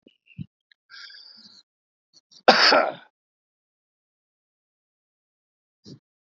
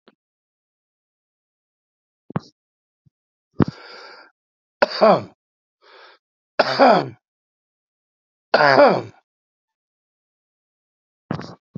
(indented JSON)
{
  "cough_length": "6.2 s",
  "cough_amplitude": 27954,
  "cough_signal_mean_std_ratio": 0.21,
  "three_cough_length": "11.8 s",
  "three_cough_amplitude": 28605,
  "three_cough_signal_mean_std_ratio": 0.25,
  "survey_phase": "beta (2021-08-13 to 2022-03-07)",
  "age": "45-64",
  "gender": "Male",
  "wearing_mask": "No",
  "symptom_cough_any": true,
  "symptom_runny_or_blocked_nose": true,
  "symptom_abdominal_pain": true,
  "symptom_onset": "3 days",
  "smoker_status": "Ex-smoker",
  "respiratory_condition_asthma": false,
  "respiratory_condition_other": false,
  "recruitment_source": "REACT",
  "submission_delay": "2 days",
  "covid_test_result": "Negative",
  "covid_test_method": "RT-qPCR"
}